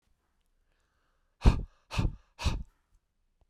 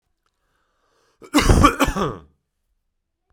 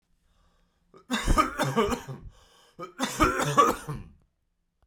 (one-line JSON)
{"exhalation_length": "3.5 s", "exhalation_amplitude": 11494, "exhalation_signal_mean_std_ratio": 0.27, "cough_length": "3.3 s", "cough_amplitude": 32767, "cough_signal_mean_std_ratio": 0.35, "three_cough_length": "4.9 s", "three_cough_amplitude": 13598, "three_cough_signal_mean_std_ratio": 0.47, "survey_phase": "beta (2021-08-13 to 2022-03-07)", "age": "18-44", "gender": "Male", "wearing_mask": "No", "symptom_runny_or_blocked_nose": true, "symptom_sore_throat": true, "symptom_fatigue": true, "symptom_headache": true, "smoker_status": "Never smoked", "respiratory_condition_asthma": false, "respiratory_condition_other": false, "recruitment_source": "Test and Trace", "submission_delay": "2 days", "covid_test_result": "Positive", "covid_test_method": "RT-qPCR"}